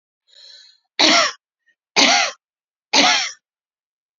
{
  "three_cough_length": "4.2 s",
  "three_cough_amplitude": 32348,
  "three_cough_signal_mean_std_ratio": 0.4,
  "survey_phase": "beta (2021-08-13 to 2022-03-07)",
  "age": "65+",
  "gender": "Female",
  "wearing_mask": "No",
  "symptom_none": true,
  "smoker_status": "Ex-smoker",
  "respiratory_condition_asthma": false,
  "respiratory_condition_other": false,
  "recruitment_source": "REACT",
  "submission_delay": "1 day",
  "covid_test_result": "Negative",
  "covid_test_method": "RT-qPCR"
}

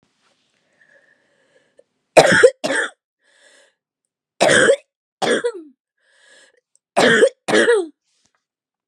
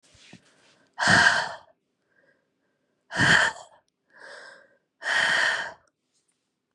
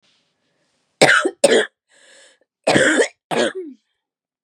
{
  "three_cough_length": "8.9 s",
  "three_cough_amplitude": 32768,
  "three_cough_signal_mean_std_ratio": 0.36,
  "exhalation_length": "6.7 s",
  "exhalation_amplitude": 19004,
  "exhalation_signal_mean_std_ratio": 0.39,
  "cough_length": "4.4 s",
  "cough_amplitude": 32767,
  "cough_signal_mean_std_ratio": 0.4,
  "survey_phase": "beta (2021-08-13 to 2022-03-07)",
  "age": "18-44",
  "gender": "Female",
  "wearing_mask": "No",
  "symptom_cough_any": true,
  "symptom_runny_or_blocked_nose": true,
  "symptom_shortness_of_breath": true,
  "symptom_sore_throat": true,
  "symptom_fever_high_temperature": true,
  "symptom_headache": true,
  "symptom_change_to_sense_of_smell_or_taste": true,
  "symptom_onset": "3 days",
  "smoker_status": "Never smoked",
  "respiratory_condition_asthma": false,
  "respiratory_condition_other": false,
  "recruitment_source": "Test and Trace",
  "submission_delay": "1 day",
  "covid_test_result": "Positive",
  "covid_test_method": "RT-qPCR",
  "covid_ct_value": 22.2,
  "covid_ct_gene": "ORF1ab gene",
  "covid_ct_mean": 23.3,
  "covid_viral_load": "23000 copies/ml",
  "covid_viral_load_category": "Low viral load (10K-1M copies/ml)"
}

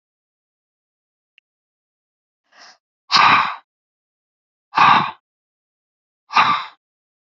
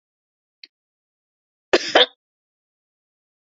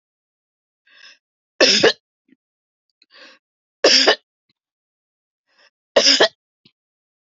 {
  "exhalation_length": "7.3 s",
  "exhalation_amplitude": 32011,
  "exhalation_signal_mean_std_ratio": 0.29,
  "cough_length": "3.6 s",
  "cough_amplitude": 31928,
  "cough_signal_mean_std_ratio": 0.18,
  "three_cough_length": "7.3 s",
  "three_cough_amplitude": 32768,
  "three_cough_signal_mean_std_ratio": 0.28,
  "survey_phase": "beta (2021-08-13 to 2022-03-07)",
  "age": "45-64",
  "gender": "Female",
  "wearing_mask": "No",
  "symptom_none": true,
  "smoker_status": "Never smoked",
  "respiratory_condition_asthma": false,
  "respiratory_condition_other": false,
  "recruitment_source": "REACT",
  "submission_delay": "3 days",
  "covid_test_result": "Negative",
  "covid_test_method": "RT-qPCR",
  "covid_ct_value": 37.0,
  "covid_ct_gene": "E gene",
  "influenza_a_test_result": "Negative",
  "influenza_b_test_result": "Negative"
}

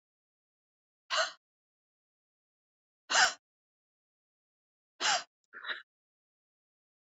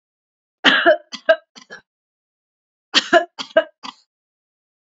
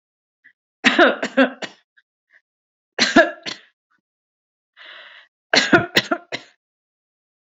{
  "exhalation_length": "7.2 s",
  "exhalation_amplitude": 7971,
  "exhalation_signal_mean_std_ratio": 0.23,
  "cough_length": "4.9 s",
  "cough_amplitude": 32767,
  "cough_signal_mean_std_ratio": 0.29,
  "three_cough_length": "7.5 s",
  "three_cough_amplitude": 31912,
  "three_cough_signal_mean_std_ratio": 0.3,
  "survey_phase": "beta (2021-08-13 to 2022-03-07)",
  "age": "45-64",
  "gender": "Female",
  "wearing_mask": "No",
  "symptom_none": true,
  "symptom_onset": "4 days",
  "smoker_status": "Ex-smoker",
  "respiratory_condition_asthma": false,
  "respiratory_condition_other": false,
  "recruitment_source": "REACT",
  "submission_delay": "3 days",
  "covid_test_result": "Negative",
  "covid_test_method": "RT-qPCR",
  "influenza_a_test_result": "Negative",
  "influenza_b_test_result": "Negative"
}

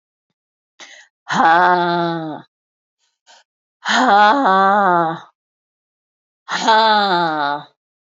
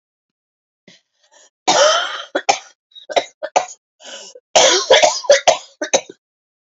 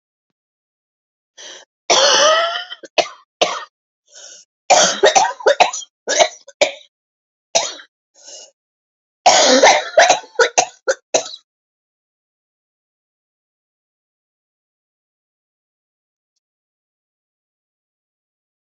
{
  "exhalation_length": "8.0 s",
  "exhalation_amplitude": 31378,
  "exhalation_signal_mean_std_ratio": 0.53,
  "cough_length": "6.7 s",
  "cough_amplitude": 32767,
  "cough_signal_mean_std_ratio": 0.4,
  "three_cough_length": "18.6 s",
  "three_cough_amplitude": 32768,
  "three_cough_signal_mean_std_ratio": 0.33,
  "survey_phase": "alpha (2021-03-01 to 2021-08-12)",
  "age": "45-64",
  "gender": "Female",
  "wearing_mask": "No",
  "symptom_new_continuous_cough": true,
  "symptom_fatigue": true,
  "smoker_status": "Never smoked",
  "respiratory_condition_asthma": false,
  "respiratory_condition_other": false,
  "recruitment_source": "REACT",
  "submission_delay": "2 days",
  "covid_test_result": "Negative",
  "covid_test_method": "RT-qPCR"
}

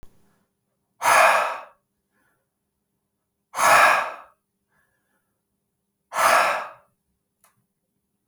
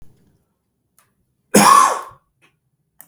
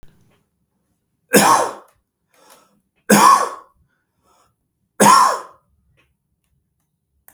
{
  "exhalation_length": "8.3 s",
  "exhalation_amplitude": 24228,
  "exhalation_signal_mean_std_ratio": 0.34,
  "cough_length": "3.1 s",
  "cough_amplitude": 32768,
  "cough_signal_mean_std_ratio": 0.31,
  "three_cough_length": "7.3 s",
  "three_cough_amplitude": 32768,
  "three_cough_signal_mean_std_ratio": 0.32,
  "survey_phase": "beta (2021-08-13 to 2022-03-07)",
  "age": "45-64",
  "gender": "Male",
  "wearing_mask": "No",
  "symptom_none": true,
  "symptom_onset": "12 days",
  "smoker_status": "Ex-smoker",
  "respiratory_condition_asthma": false,
  "respiratory_condition_other": false,
  "recruitment_source": "REACT",
  "submission_delay": "15 days",
  "covid_test_result": "Negative",
  "covid_test_method": "RT-qPCR",
  "influenza_a_test_result": "Negative",
  "influenza_b_test_result": "Negative"
}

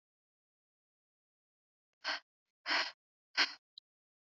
{
  "exhalation_length": "4.3 s",
  "exhalation_amplitude": 4715,
  "exhalation_signal_mean_std_ratio": 0.25,
  "survey_phase": "beta (2021-08-13 to 2022-03-07)",
  "age": "45-64",
  "gender": "Female",
  "wearing_mask": "No",
  "symptom_none": true,
  "smoker_status": "Never smoked",
  "respiratory_condition_asthma": false,
  "respiratory_condition_other": false,
  "recruitment_source": "REACT",
  "submission_delay": "2 days",
  "covid_test_result": "Negative",
  "covid_test_method": "RT-qPCR",
  "influenza_a_test_result": "Negative",
  "influenza_b_test_result": "Negative"
}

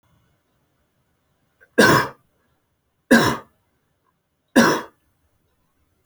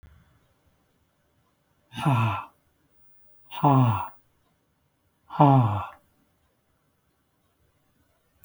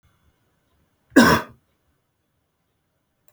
{
  "three_cough_length": "6.1 s",
  "three_cough_amplitude": 30185,
  "three_cough_signal_mean_std_ratio": 0.28,
  "exhalation_length": "8.4 s",
  "exhalation_amplitude": 20184,
  "exhalation_signal_mean_std_ratio": 0.32,
  "cough_length": "3.3 s",
  "cough_amplitude": 28039,
  "cough_signal_mean_std_ratio": 0.21,
  "survey_phase": "alpha (2021-03-01 to 2021-08-12)",
  "age": "45-64",
  "gender": "Male",
  "wearing_mask": "No",
  "symptom_none": true,
  "smoker_status": "Never smoked",
  "respiratory_condition_asthma": false,
  "respiratory_condition_other": false,
  "recruitment_source": "REACT",
  "submission_delay": "1 day",
  "covid_test_result": "Negative",
  "covid_test_method": "RT-qPCR"
}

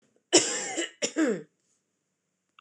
{
  "cough_length": "2.6 s",
  "cough_amplitude": 17546,
  "cough_signal_mean_std_ratio": 0.4,
  "survey_phase": "beta (2021-08-13 to 2022-03-07)",
  "age": "45-64",
  "gender": "Female",
  "wearing_mask": "No",
  "symptom_fatigue": true,
  "symptom_headache": true,
  "symptom_onset": "12 days",
  "smoker_status": "Ex-smoker",
  "respiratory_condition_asthma": false,
  "respiratory_condition_other": false,
  "recruitment_source": "REACT",
  "submission_delay": "3 days",
  "covid_test_result": "Negative",
  "covid_test_method": "RT-qPCR",
  "influenza_a_test_result": "Negative",
  "influenza_b_test_result": "Negative"
}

